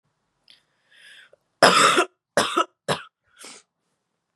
{"three_cough_length": "4.4 s", "three_cough_amplitude": 31717, "three_cough_signal_mean_std_ratio": 0.32, "survey_phase": "beta (2021-08-13 to 2022-03-07)", "age": "18-44", "gender": "Female", "wearing_mask": "No", "symptom_cough_any": true, "symptom_new_continuous_cough": true, "symptom_runny_or_blocked_nose": true, "symptom_shortness_of_breath": true, "symptom_sore_throat": true, "symptom_fatigue": true, "symptom_fever_high_temperature": true, "symptom_headache": true, "symptom_onset": "2 days", "smoker_status": "Never smoked", "respiratory_condition_asthma": false, "respiratory_condition_other": false, "recruitment_source": "Test and Trace", "submission_delay": "2 days", "covid_test_result": "Positive", "covid_test_method": "ePCR"}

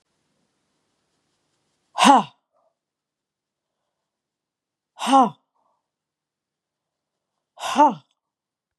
{"exhalation_length": "8.8 s", "exhalation_amplitude": 30907, "exhalation_signal_mean_std_ratio": 0.22, "survey_phase": "beta (2021-08-13 to 2022-03-07)", "age": "45-64", "gender": "Female", "wearing_mask": "No", "symptom_runny_or_blocked_nose": true, "smoker_status": "Never smoked", "respiratory_condition_asthma": false, "respiratory_condition_other": false, "recruitment_source": "Test and Trace", "submission_delay": "1 day", "covid_test_result": "Positive", "covid_test_method": "RT-qPCR", "covid_ct_value": 20.8, "covid_ct_gene": "ORF1ab gene"}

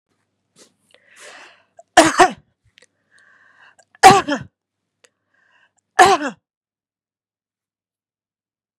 {"three_cough_length": "8.8 s", "three_cough_amplitude": 32768, "three_cough_signal_mean_std_ratio": 0.22, "survey_phase": "beta (2021-08-13 to 2022-03-07)", "age": "45-64", "gender": "Female", "wearing_mask": "No", "symptom_none": true, "smoker_status": "Never smoked", "respiratory_condition_asthma": false, "respiratory_condition_other": false, "recruitment_source": "Test and Trace", "submission_delay": "1 day", "covid_test_result": "Positive", "covid_test_method": "ePCR"}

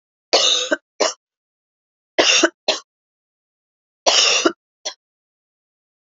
{"three_cough_length": "6.1 s", "three_cough_amplitude": 32767, "three_cough_signal_mean_std_ratio": 0.37, "survey_phase": "alpha (2021-03-01 to 2021-08-12)", "age": "18-44", "gender": "Female", "wearing_mask": "No", "symptom_cough_any": true, "symptom_shortness_of_breath": true, "symptom_fatigue": true, "symptom_fever_high_temperature": true, "symptom_headache": true, "symptom_change_to_sense_of_smell_or_taste": true, "symptom_loss_of_taste": true, "symptom_onset": "2 days", "smoker_status": "Never smoked", "respiratory_condition_asthma": false, "respiratory_condition_other": false, "recruitment_source": "Test and Trace", "submission_delay": "2 days", "covid_test_result": "Positive", "covid_test_method": "RT-qPCR", "covid_ct_value": 20.3, "covid_ct_gene": "ORF1ab gene", "covid_ct_mean": 20.9, "covid_viral_load": "140000 copies/ml", "covid_viral_load_category": "Low viral load (10K-1M copies/ml)"}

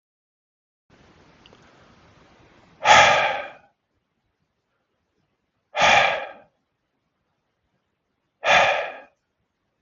{"exhalation_length": "9.8 s", "exhalation_amplitude": 32265, "exhalation_signal_mean_std_ratio": 0.3, "survey_phase": "beta (2021-08-13 to 2022-03-07)", "age": "18-44", "gender": "Male", "wearing_mask": "No", "symptom_none": true, "smoker_status": "Ex-smoker", "respiratory_condition_asthma": false, "respiratory_condition_other": false, "recruitment_source": "REACT", "submission_delay": "1 day", "covid_test_result": "Negative", "covid_test_method": "RT-qPCR", "influenza_a_test_result": "Negative", "influenza_b_test_result": "Negative"}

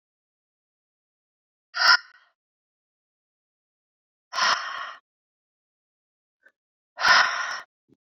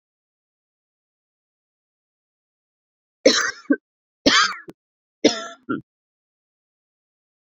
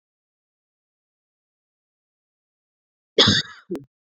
{"exhalation_length": "8.1 s", "exhalation_amplitude": 22483, "exhalation_signal_mean_std_ratio": 0.27, "three_cough_length": "7.6 s", "three_cough_amplitude": 28405, "three_cough_signal_mean_std_ratio": 0.24, "cough_length": "4.2 s", "cough_amplitude": 30545, "cough_signal_mean_std_ratio": 0.2, "survey_phase": "beta (2021-08-13 to 2022-03-07)", "age": "45-64", "gender": "Female", "wearing_mask": "No", "symptom_cough_any": true, "symptom_new_continuous_cough": true, "symptom_runny_or_blocked_nose": true, "symptom_shortness_of_breath": true, "symptom_sore_throat": true, "symptom_abdominal_pain": true, "symptom_diarrhoea": true, "symptom_fatigue": true, "symptom_fever_high_temperature": true, "symptom_headache": true, "symptom_change_to_sense_of_smell_or_taste": true, "symptom_loss_of_taste": true, "smoker_status": "Ex-smoker", "respiratory_condition_asthma": false, "respiratory_condition_other": false, "recruitment_source": "Test and Trace", "submission_delay": "2 days", "covid_test_result": "Positive", "covid_test_method": "LFT"}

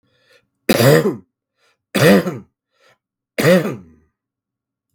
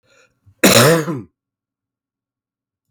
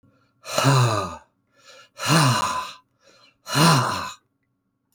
{"three_cough_length": "4.9 s", "three_cough_amplitude": 32768, "three_cough_signal_mean_std_ratio": 0.37, "cough_length": "2.9 s", "cough_amplitude": 32768, "cough_signal_mean_std_ratio": 0.33, "exhalation_length": "4.9 s", "exhalation_amplitude": 21283, "exhalation_signal_mean_std_ratio": 0.51, "survey_phase": "alpha (2021-03-01 to 2021-08-12)", "age": "65+", "gender": "Male", "wearing_mask": "No", "symptom_cough_any": true, "symptom_change_to_sense_of_smell_or_taste": true, "smoker_status": "Never smoked", "respiratory_condition_asthma": false, "respiratory_condition_other": false, "recruitment_source": "Test and Trace", "submission_delay": "1 day", "covid_test_result": "Positive", "covid_test_method": "RT-qPCR"}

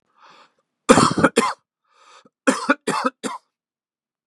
{"cough_length": "4.3 s", "cough_amplitude": 32768, "cough_signal_mean_std_ratio": 0.34, "survey_phase": "beta (2021-08-13 to 2022-03-07)", "age": "45-64", "gender": "Male", "wearing_mask": "No", "symptom_cough_any": true, "symptom_runny_or_blocked_nose": true, "symptom_sore_throat": true, "smoker_status": "Never smoked", "respiratory_condition_asthma": false, "respiratory_condition_other": false, "recruitment_source": "Test and Trace", "submission_delay": "2 days", "covid_test_result": "Positive", "covid_test_method": "LFT"}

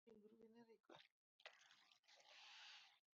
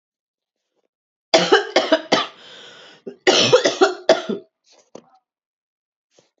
{"exhalation_length": "3.2 s", "exhalation_amplitude": 249, "exhalation_signal_mean_std_ratio": 0.71, "cough_length": "6.4 s", "cough_amplitude": 31193, "cough_signal_mean_std_ratio": 0.36, "survey_phase": "beta (2021-08-13 to 2022-03-07)", "age": "18-44", "gender": "Male", "wearing_mask": "No", "symptom_cough_any": true, "symptom_sore_throat": true, "symptom_fatigue": true, "symptom_headache": true, "smoker_status": "Ex-smoker", "respiratory_condition_asthma": false, "respiratory_condition_other": false, "recruitment_source": "Test and Trace", "submission_delay": "2 days", "covid_test_result": "Negative", "covid_test_method": "RT-qPCR"}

